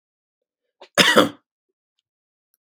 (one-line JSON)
{"cough_length": "2.6 s", "cough_amplitude": 32768, "cough_signal_mean_std_ratio": 0.26, "survey_phase": "beta (2021-08-13 to 2022-03-07)", "age": "45-64", "gender": "Male", "wearing_mask": "No", "symptom_none": true, "smoker_status": "Ex-smoker", "respiratory_condition_asthma": false, "respiratory_condition_other": false, "recruitment_source": "REACT", "submission_delay": "6 days", "covid_test_result": "Negative", "covid_test_method": "RT-qPCR", "influenza_a_test_result": "Negative", "influenza_b_test_result": "Negative"}